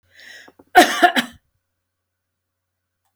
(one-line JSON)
{"cough_length": "3.2 s", "cough_amplitude": 31562, "cough_signal_mean_std_ratio": 0.26, "survey_phase": "beta (2021-08-13 to 2022-03-07)", "age": "65+", "gender": "Female", "wearing_mask": "No", "symptom_runny_or_blocked_nose": true, "symptom_onset": "9 days", "smoker_status": "Ex-smoker", "respiratory_condition_asthma": false, "respiratory_condition_other": false, "recruitment_source": "REACT", "submission_delay": "1 day", "covid_test_result": "Negative", "covid_test_method": "RT-qPCR"}